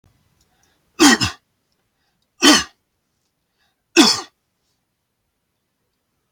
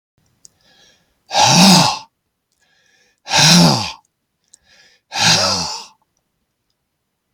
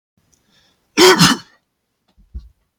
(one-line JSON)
{"three_cough_length": "6.3 s", "three_cough_amplitude": 31794, "three_cough_signal_mean_std_ratio": 0.25, "exhalation_length": "7.3 s", "exhalation_amplitude": 32768, "exhalation_signal_mean_std_ratio": 0.4, "cough_length": "2.8 s", "cough_amplitude": 32768, "cough_signal_mean_std_ratio": 0.31, "survey_phase": "beta (2021-08-13 to 2022-03-07)", "age": "45-64", "gender": "Male", "wearing_mask": "No", "symptom_none": true, "smoker_status": "Never smoked", "respiratory_condition_asthma": false, "respiratory_condition_other": false, "recruitment_source": "REACT", "submission_delay": "2 days", "covid_test_result": "Negative", "covid_test_method": "RT-qPCR", "influenza_a_test_result": "Negative", "influenza_b_test_result": "Negative"}